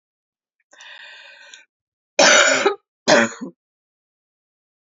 {"cough_length": "4.9 s", "cough_amplitude": 31833, "cough_signal_mean_std_ratio": 0.33, "survey_phase": "beta (2021-08-13 to 2022-03-07)", "age": "45-64", "gender": "Female", "wearing_mask": "No", "symptom_new_continuous_cough": true, "symptom_runny_or_blocked_nose": true, "symptom_sore_throat": true, "symptom_other": true, "smoker_status": "Never smoked", "respiratory_condition_asthma": false, "respiratory_condition_other": false, "recruitment_source": "Test and Trace", "submission_delay": "3 days", "covid_test_result": "Positive", "covid_test_method": "ePCR"}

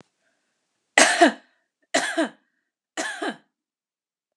{"three_cough_length": "4.4 s", "three_cough_amplitude": 32680, "three_cough_signal_mean_std_ratio": 0.31, "survey_phase": "beta (2021-08-13 to 2022-03-07)", "age": "45-64", "gender": "Female", "wearing_mask": "No", "symptom_cough_any": true, "symptom_runny_or_blocked_nose": true, "symptom_shortness_of_breath": true, "symptom_sore_throat": true, "symptom_fatigue": true, "symptom_headache": true, "symptom_change_to_sense_of_smell_or_taste": true, "symptom_onset": "5 days", "smoker_status": "Never smoked", "respiratory_condition_asthma": false, "respiratory_condition_other": false, "recruitment_source": "REACT", "submission_delay": "6 days", "covid_test_result": "Positive", "covid_test_method": "RT-qPCR", "covid_ct_value": 23.0, "covid_ct_gene": "E gene", "influenza_a_test_result": "Negative", "influenza_b_test_result": "Negative"}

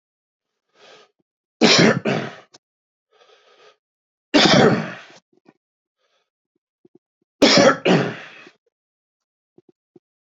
{"three_cough_length": "10.2 s", "three_cough_amplitude": 32661, "three_cough_signal_mean_std_ratio": 0.32, "survey_phase": "beta (2021-08-13 to 2022-03-07)", "age": "45-64", "gender": "Male", "wearing_mask": "No", "symptom_cough_any": true, "smoker_status": "Never smoked", "respiratory_condition_asthma": false, "respiratory_condition_other": false, "recruitment_source": "Test and Trace", "submission_delay": "2 days", "covid_test_result": "Positive", "covid_test_method": "RT-qPCR"}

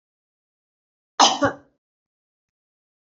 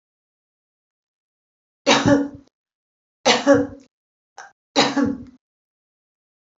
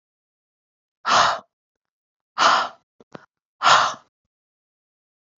{"cough_length": "3.2 s", "cough_amplitude": 27771, "cough_signal_mean_std_ratio": 0.21, "three_cough_length": "6.6 s", "three_cough_amplitude": 28427, "three_cough_signal_mean_std_ratio": 0.33, "exhalation_length": "5.4 s", "exhalation_amplitude": 28356, "exhalation_signal_mean_std_ratio": 0.32, "survey_phase": "beta (2021-08-13 to 2022-03-07)", "age": "65+", "gender": "Female", "wearing_mask": "No", "symptom_none": true, "smoker_status": "Ex-smoker", "respiratory_condition_asthma": false, "respiratory_condition_other": false, "recruitment_source": "REACT", "submission_delay": "2 days", "covid_test_result": "Negative", "covid_test_method": "RT-qPCR"}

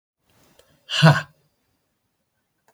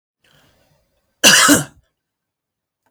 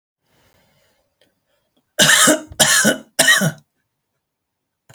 {"exhalation_length": "2.7 s", "exhalation_amplitude": 26740, "exhalation_signal_mean_std_ratio": 0.24, "cough_length": "2.9 s", "cough_amplitude": 32768, "cough_signal_mean_std_ratio": 0.3, "three_cough_length": "4.9 s", "three_cough_amplitude": 32768, "three_cough_signal_mean_std_ratio": 0.38, "survey_phase": "beta (2021-08-13 to 2022-03-07)", "age": "45-64", "gender": "Male", "wearing_mask": "No", "symptom_none": true, "smoker_status": "Never smoked", "respiratory_condition_asthma": true, "respiratory_condition_other": false, "recruitment_source": "REACT", "submission_delay": "3 days", "covid_test_result": "Negative", "covid_test_method": "RT-qPCR"}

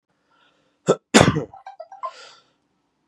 {"three_cough_length": "3.1 s", "three_cough_amplitude": 32768, "three_cough_signal_mean_std_ratio": 0.26, "survey_phase": "beta (2021-08-13 to 2022-03-07)", "age": "18-44", "gender": "Male", "wearing_mask": "No", "symptom_runny_or_blocked_nose": true, "symptom_onset": "7 days", "smoker_status": "Ex-smoker", "respiratory_condition_asthma": false, "respiratory_condition_other": false, "recruitment_source": "Test and Trace", "submission_delay": "2 days", "covid_test_result": "Positive", "covid_test_method": "RT-qPCR", "covid_ct_value": 27.8, "covid_ct_gene": "N gene"}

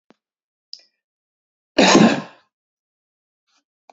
{"cough_length": "3.9 s", "cough_amplitude": 29548, "cough_signal_mean_std_ratio": 0.26, "survey_phase": "beta (2021-08-13 to 2022-03-07)", "age": "45-64", "gender": "Male", "wearing_mask": "No", "symptom_none": true, "smoker_status": "Never smoked", "respiratory_condition_asthma": false, "respiratory_condition_other": false, "recruitment_source": "REACT", "submission_delay": "1 day", "covid_test_result": "Negative", "covid_test_method": "RT-qPCR", "influenza_a_test_result": "Negative", "influenza_b_test_result": "Negative"}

